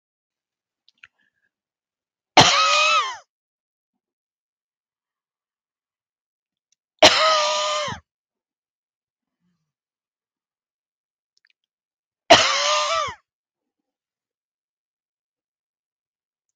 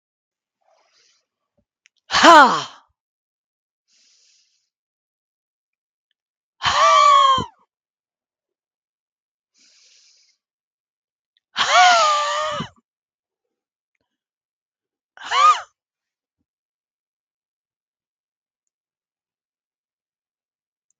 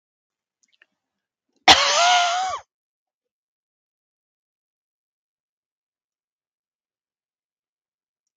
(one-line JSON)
{"three_cough_length": "16.6 s", "three_cough_amplitude": 32768, "three_cough_signal_mean_std_ratio": 0.27, "exhalation_length": "21.0 s", "exhalation_amplitude": 32768, "exhalation_signal_mean_std_ratio": 0.27, "cough_length": "8.4 s", "cough_amplitude": 32768, "cough_signal_mean_std_ratio": 0.23, "survey_phase": "beta (2021-08-13 to 2022-03-07)", "age": "65+", "gender": "Female", "wearing_mask": "No", "symptom_cough_any": true, "symptom_change_to_sense_of_smell_or_taste": true, "smoker_status": "Ex-smoker", "respiratory_condition_asthma": false, "respiratory_condition_other": true, "recruitment_source": "Test and Trace", "submission_delay": "0 days", "covid_test_result": "Negative", "covid_test_method": "LFT"}